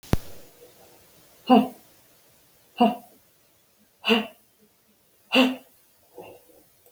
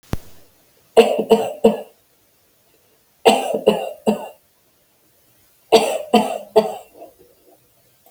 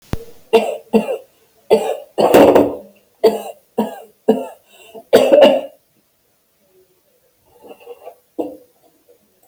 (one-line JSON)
{"exhalation_length": "6.9 s", "exhalation_amplitude": 19530, "exhalation_signal_mean_std_ratio": 0.29, "three_cough_length": "8.1 s", "three_cough_amplitude": 32768, "three_cough_signal_mean_std_ratio": 0.36, "cough_length": "9.5 s", "cough_amplitude": 32768, "cough_signal_mean_std_ratio": 0.38, "survey_phase": "beta (2021-08-13 to 2022-03-07)", "age": "45-64", "gender": "Female", "wearing_mask": "No", "symptom_sore_throat": true, "smoker_status": "Never smoked", "respiratory_condition_asthma": false, "respiratory_condition_other": false, "recruitment_source": "REACT", "submission_delay": "1 day", "covid_test_result": "Negative", "covid_test_method": "RT-qPCR", "influenza_a_test_result": "Negative", "influenza_b_test_result": "Negative"}